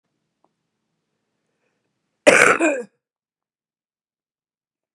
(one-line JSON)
{"cough_length": "4.9 s", "cough_amplitude": 32768, "cough_signal_mean_std_ratio": 0.23, "survey_phase": "beta (2021-08-13 to 2022-03-07)", "age": "65+", "gender": "Female", "wearing_mask": "No", "symptom_cough_any": true, "smoker_status": "Ex-smoker", "respiratory_condition_asthma": false, "respiratory_condition_other": false, "recruitment_source": "Test and Trace", "submission_delay": "1 day", "covid_test_result": "Negative", "covid_test_method": "RT-qPCR"}